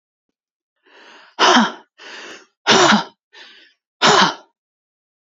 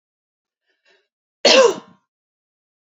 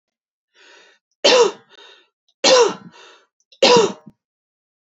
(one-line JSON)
{"exhalation_length": "5.2 s", "exhalation_amplitude": 31076, "exhalation_signal_mean_std_ratio": 0.37, "cough_length": "3.0 s", "cough_amplitude": 32767, "cough_signal_mean_std_ratio": 0.25, "three_cough_length": "4.9 s", "three_cough_amplitude": 30942, "three_cough_signal_mean_std_ratio": 0.35, "survey_phase": "beta (2021-08-13 to 2022-03-07)", "age": "45-64", "gender": "Female", "wearing_mask": "No", "symptom_none": true, "smoker_status": "Never smoked", "respiratory_condition_asthma": false, "respiratory_condition_other": false, "recruitment_source": "REACT", "submission_delay": "2 days", "covid_test_result": "Negative", "covid_test_method": "RT-qPCR"}